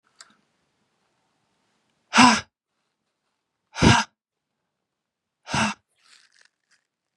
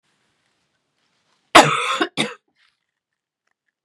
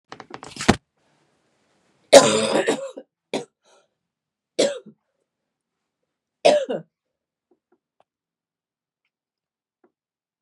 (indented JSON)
{
  "exhalation_length": "7.2 s",
  "exhalation_amplitude": 28059,
  "exhalation_signal_mean_std_ratio": 0.23,
  "cough_length": "3.8 s",
  "cough_amplitude": 32768,
  "cough_signal_mean_std_ratio": 0.24,
  "three_cough_length": "10.4 s",
  "three_cough_amplitude": 32768,
  "three_cough_signal_mean_std_ratio": 0.23,
  "survey_phase": "beta (2021-08-13 to 2022-03-07)",
  "age": "18-44",
  "gender": "Female",
  "wearing_mask": "No",
  "symptom_cough_any": true,
  "symptom_runny_or_blocked_nose": true,
  "symptom_sore_throat": true,
  "symptom_diarrhoea": true,
  "symptom_fatigue": true,
  "symptom_headache": true,
  "symptom_onset": "2 days",
  "smoker_status": "Never smoked",
  "respiratory_condition_asthma": false,
  "respiratory_condition_other": false,
  "recruitment_source": "Test and Trace",
  "submission_delay": "2 days",
  "covid_test_result": "Positive",
  "covid_test_method": "RT-qPCR",
  "covid_ct_value": 16.3,
  "covid_ct_gene": "ORF1ab gene",
  "covid_ct_mean": 16.5,
  "covid_viral_load": "3800000 copies/ml",
  "covid_viral_load_category": "High viral load (>1M copies/ml)"
}